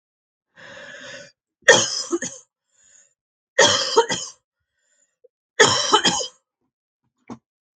{
  "three_cough_length": "7.8 s",
  "three_cough_amplitude": 32767,
  "three_cough_signal_mean_std_ratio": 0.34,
  "survey_phase": "beta (2021-08-13 to 2022-03-07)",
  "age": "65+",
  "gender": "Female",
  "wearing_mask": "No",
  "symptom_none": true,
  "smoker_status": "Ex-smoker",
  "respiratory_condition_asthma": false,
  "respiratory_condition_other": false,
  "recruitment_source": "REACT",
  "submission_delay": "1 day",
  "covid_test_result": "Negative",
  "covid_test_method": "RT-qPCR",
  "influenza_a_test_result": "Negative",
  "influenza_b_test_result": "Negative"
}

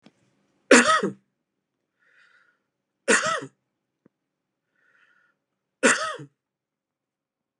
{
  "three_cough_length": "7.6 s",
  "three_cough_amplitude": 29538,
  "three_cough_signal_mean_std_ratio": 0.25,
  "survey_phase": "beta (2021-08-13 to 2022-03-07)",
  "age": "45-64",
  "gender": "Male",
  "wearing_mask": "No",
  "symptom_cough_any": true,
  "symptom_runny_or_blocked_nose": true,
  "symptom_shortness_of_breath": true,
  "smoker_status": "Ex-smoker",
  "respiratory_condition_asthma": true,
  "respiratory_condition_other": false,
  "recruitment_source": "Test and Trace",
  "submission_delay": "1 day",
  "covid_test_result": "Negative",
  "covid_test_method": "LFT"
}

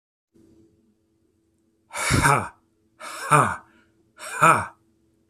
{
  "exhalation_length": "5.3 s",
  "exhalation_amplitude": 26484,
  "exhalation_signal_mean_std_ratio": 0.35,
  "survey_phase": "beta (2021-08-13 to 2022-03-07)",
  "age": "45-64",
  "gender": "Male",
  "wearing_mask": "No",
  "symptom_none": true,
  "smoker_status": "Never smoked",
  "respiratory_condition_asthma": false,
  "respiratory_condition_other": false,
  "recruitment_source": "REACT",
  "submission_delay": "33 days",
  "covid_test_result": "Negative",
  "covid_test_method": "RT-qPCR",
  "influenza_a_test_result": "Negative",
  "influenza_b_test_result": "Negative"
}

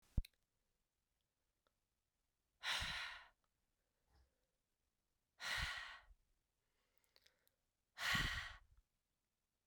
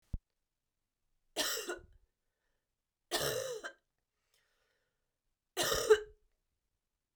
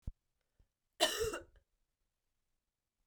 {
  "exhalation_length": "9.7 s",
  "exhalation_amplitude": 1993,
  "exhalation_signal_mean_std_ratio": 0.31,
  "three_cough_length": "7.2 s",
  "three_cough_amplitude": 7231,
  "three_cough_signal_mean_std_ratio": 0.29,
  "cough_length": "3.1 s",
  "cough_amplitude": 4923,
  "cough_signal_mean_std_ratio": 0.27,
  "survey_phase": "beta (2021-08-13 to 2022-03-07)",
  "age": "18-44",
  "gender": "Female",
  "wearing_mask": "No",
  "symptom_cough_any": true,
  "symptom_runny_or_blocked_nose": true,
  "symptom_fatigue": true,
  "symptom_change_to_sense_of_smell_or_taste": true,
  "symptom_loss_of_taste": true,
  "symptom_onset": "3 days",
  "smoker_status": "Never smoked",
  "respiratory_condition_asthma": false,
  "respiratory_condition_other": false,
  "recruitment_source": "Test and Trace",
  "submission_delay": "2 days",
  "covid_test_result": "Positive",
  "covid_test_method": "RT-qPCR",
  "covid_ct_value": 24.4,
  "covid_ct_gene": "ORF1ab gene"
}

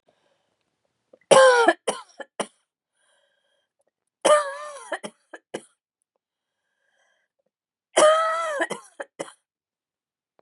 {
  "three_cough_length": "10.4 s",
  "three_cough_amplitude": 30397,
  "three_cough_signal_mean_std_ratio": 0.3,
  "survey_phase": "beta (2021-08-13 to 2022-03-07)",
  "age": "45-64",
  "gender": "Female",
  "wearing_mask": "Yes",
  "symptom_cough_any": true,
  "symptom_sore_throat": true,
  "symptom_fatigue": true,
  "symptom_headache": true,
  "smoker_status": "Never smoked",
  "respiratory_condition_asthma": false,
  "respiratory_condition_other": false,
  "recruitment_source": "Test and Trace",
  "submission_delay": "1 day",
  "covid_test_result": "Positive",
  "covid_test_method": "LFT"
}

